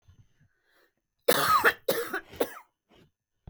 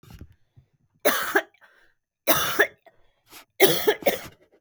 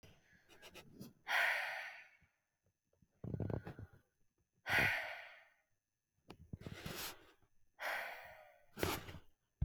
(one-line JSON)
{"cough_length": "3.5 s", "cough_amplitude": 15589, "cough_signal_mean_std_ratio": 0.37, "three_cough_length": "4.6 s", "three_cough_amplitude": 29394, "three_cough_signal_mean_std_ratio": 0.38, "exhalation_length": "9.6 s", "exhalation_amplitude": 3136, "exhalation_signal_mean_std_ratio": 0.43, "survey_phase": "beta (2021-08-13 to 2022-03-07)", "age": "18-44", "gender": "Female", "wearing_mask": "No", "symptom_cough_any": true, "symptom_fatigue": true, "symptom_headache": true, "symptom_onset": "1 day", "smoker_status": "Ex-smoker", "respiratory_condition_asthma": false, "respiratory_condition_other": false, "recruitment_source": "Test and Trace", "submission_delay": "1 day", "covid_test_result": "Negative", "covid_test_method": "RT-qPCR"}